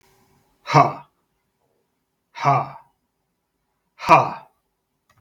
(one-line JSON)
{"exhalation_length": "5.2 s", "exhalation_amplitude": 32768, "exhalation_signal_mean_std_ratio": 0.27, "survey_phase": "beta (2021-08-13 to 2022-03-07)", "age": "45-64", "gender": "Male", "wearing_mask": "No", "symptom_none": true, "smoker_status": "Ex-smoker", "respiratory_condition_asthma": false, "respiratory_condition_other": false, "recruitment_source": "REACT", "submission_delay": "3 days", "covid_test_result": "Negative", "covid_test_method": "RT-qPCR"}